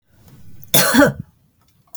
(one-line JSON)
{"cough_length": "2.0 s", "cough_amplitude": 32768, "cough_signal_mean_std_ratio": 0.39, "survey_phase": "beta (2021-08-13 to 2022-03-07)", "age": "45-64", "gender": "Female", "wearing_mask": "No", "symptom_none": true, "smoker_status": "Never smoked", "respiratory_condition_asthma": false, "respiratory_condition_other": false, "recruitment_source": "REACT", "submission_delay": "3 days", "covid_test_result": "Negative", "covid_test_method": "RT-qPCR", "influenza_a_test_result": "Negative", "influenza_b_test_result": "Negative"}